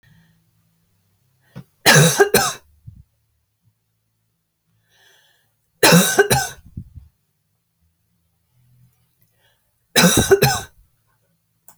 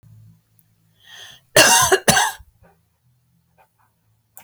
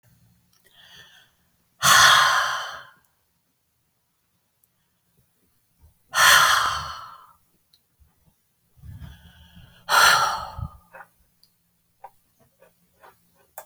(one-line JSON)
{"three_cough_length": "11.8 s", "three_cough_amplitude": 32768, "three_cough_signal_mean_std_ratio": 0.31, "cough_length": "4.4 s", "cough_amplitude": 32768, "cough_signal_mean_std_ratio": 0.31, "exhalation_length": "13.7 s", "exhalation_amplitude": 28501, "exhalation_signal_mean_std_ratio": 0.32, "survey_phase": "beta (2021-08-13 to 2022-03-07)", "age": "65+", "gender": "Female", "wearing_mask": "No", "symptom_none": true, "smoker_status": "Never smoked", "respiratory_condition_asthma": false, "respiratory_condition_other": false, "recruitment_source": "REACT", "submission_delay": "7 days", "covid_test_result": "Negative", "covid_test_method": "RT-qPCR"}